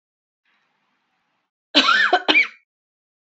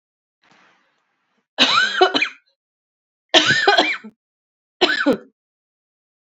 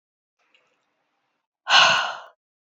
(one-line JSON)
{"cough_length": "3.3 s", "cough_amplitude": 29414, "cough_signal_mean_std_ratio": 0.35, "three_cough_length": "6.4 s", "three_cough_amplitude": 32299, "three_cough_signal_mean_std_ratio": 0.39, "exhalation_length": "2.7 s", "exhalation_amplitude": 26314, "exhalation_signal_mean_std_ratio": 0.31, "survey_phase": "alpha (2021-03-01 to 2021-08-12)", "age": "18-44", "gender": "Female", "wearing_mask": "No", "symptom_cough_any": true, "symptom_shortness_of_breath": true, "symptom_onset": "4 days", "smoker_status": "Ex-smoker", "respiratory_condition_asthma": false, "respiratory_condition_other": false, "recruitment_source": "REACT", "submission_delay": "3 days", "covid_test_result": "Negative", "covid_test_method": "RT-qPCR"}